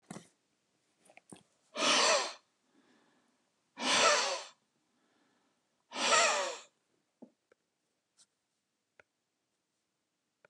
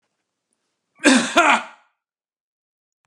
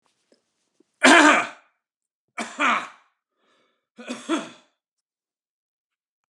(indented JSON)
{
  "exhalation_length": "10.5 s",
  "exhalation_amplitude": 6736,
  "exhalation_signal_mean_std_ratio": 0.33,
  "cough_length": "3.1 s",
  "cough_amplitude": 32767,
  "cough_signal_mean_std_ratio": 0.31,
  "three_cough_length": "6.3 s",
  "three_cough_amplitude": 32767,
  "three_cough_signal_mean_std_ratio": 0.27,
  "survey_phase": "beta (2021-08-13 to 2022-03-07)",
  "age": "45-64",
  "gender": "Male",
  "wearing_mask": "No",
  "symptom_none": true,
  "smoker_status": "Ex-smoker",
  "respiratory_condition_asthma": false,
  "respiratory_condition_other": false,
  "recruitment_source": "REACT",
  "submission_delay": "1 day",
  "covid_test_result": "Negative",
  "covid_test_method": "RT-qPCR"
}